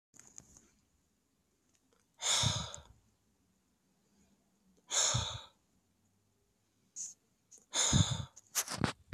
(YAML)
exhalation_length: 9.1 s
exhalation_amplitude: 6566
exhalation_signal_mean_std_ratio: 0.35
survey_phase: alpha (2021-03-01 to 2021-08-12)
age: 18-44
gender: Male
wearing_mask: 'No'
symptom_none: true
smoker_status: Never smoked
respiratory_condition_asthma: false
respiratory_condition_other: false
recruitment_source: REACT
submission_delay: 1 day
covid_test_result: Negative
covid_test_method: RT-qPCR